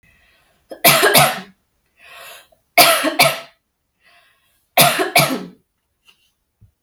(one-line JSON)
{"three_cough_length": "6.8 s", "three_cough_amplitude": 32768, "three_cough_signal_mean_std_ratio": 0.38, "survey_phase": "beta (2021-08-13 to 2022-03-07)", "age": "18-44", "gender": "Female", "wearing_mask": "No", "symptom_runny_or_blocked_nose": true, "symptom_onset": "7 days", "smoker_status": "Never smoked", "respiratory_condition_asthma": false, "respiratory_condition_other": false, "recruitment_source": "REACT", "submission_delay": "1 day", "covid_test_result": "Negative", "covid_test_method": "RT-qPCR", "influenza_a_test_result": "Negative", "influenza_b_test_result": "Negative"}